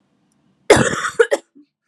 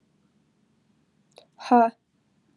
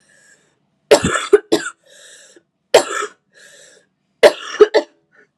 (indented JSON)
{
  "cough_length": "1.9 s",
  "cough_amplitude": 32768,
  "cough_signal_mean_std_ratio": 0.35,
  "exhalation_length": "2.6 s",
  "exhalation_amplitude": 17770,
  "exhalation_signal_mean_std_ratio": 0.22,
  "three_cough_length": "5.4 s",
  "three_cough_amplitude": 32768,
  "three_cough_signal_mean_std_ratio": 0.3,
  "survey_phase": "beta (2021-08-13 to 2022-03-07)",
  "age": "18-44",
  "gender": "Female",
  "wearing_mask": "No",
  "symptom_cough_any": true,
  "symptom_new_continuous_cough": true,
  "symptom_runny_or_blocked_nose": true,
  "symptom_sore_throat": true,
  "symptom_abdominal_pain": true,
  "symptom_fatigue": true,
  "symptom_fever_high_temperature": true,
  "symptom_headache": true,
  "symptom_change_to_sense_of_smell_or_taste": true,
  "symptom_loss_of_taste": true,
  "symptom_onset": "2 days",
  "smoker_status": "Current smoker (e-cigarettes or vapes only)",
  "respiratory_condition_asthma": false,
  "respiratory_condition_other": false,
  "recruitment_source": "Test and Trace",
  "submission_delay": "1 day",
  "covid_test_result": "Positive",
  "covid_test_method": "RT-qPCR",
  "covid_ct_value": 18.8,
  "covid_ct_gene": "N gene"
}